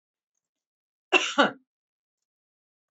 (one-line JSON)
{"cough_length": "2.9 s", "cough_amplitude": 20627, "cough_signal_mean_std_ratio": 0.23, "survey_phase": "beta (2021-08-13 to 2022-03-07)", "age": "45-64", "gender": "Female", "wearing_mask": "No", "symptom_none": true, "smoker_status": "Never smoked", "respiratory_condition_asthma": false, "respiratory_condition_other": false, "recruitment_source": "REACT", "submission_delay": "2 days", "covid_test_result": "Negative", "covid_test_method": "RT-qPCR", "influenza_a_test_result": "Negative", "influenza_b_test_result": "Negative"}